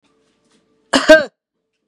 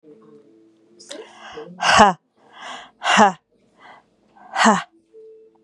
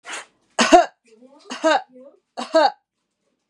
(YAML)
cough_length: 1.9 s
cough_amplitude: 32768
cough_signal_mean_std_ratio: 0.27
exhalation_length: 5.6 s
exhalation_amplitude: 32767
exhalation_signal_mean_std_ratio: 0.33
three_cough_length: 3.5 s
three_cough_amplitude: 32767
three_cough_signal_mean_std_ratio: 0.35
survey_phase: beta (2021-08-13 to 2022-03-07)
age: 45-64
gender: Female
wearing_mask: 'No'
symptom_none: true
smoker_status: Ex-smoker
respiratory_condition_asthma: false
respiratory_condition_other: false
recruitment_source: REACT
submission_delay: 3 days
covid_test_result: Negative
covid_test_method: RT-qPCR
influenza_a_test_result: Negative
influenza_b_test_result: Negative